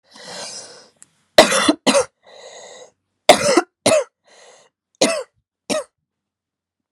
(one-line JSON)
{"three_cough_length": "6.9 s", "three_cough_amplitude": 32768, "three_cough_signal_mean_std_ratio": 0.34, "survey_phase": "alpha (2021-03-01 to 2021-08-12)", "age": "18-44", "gender": "Female", "wearing_mask": "No", "symptom_cough_any": true, "symptom_shortness_of_breath": true, "symptom_fatigue": true, "symptom_headache": true, "symptom_onset": "3 days", "smoker_status": "Never smoked", "respiratory_condition_asthma": true, "respiratory_condition_other": false, "recruitment_source": "Test and Trace", "submission_delay": "2 days", "covid_test_result": "Positive", "covid_test_method": "RT-qPCR"}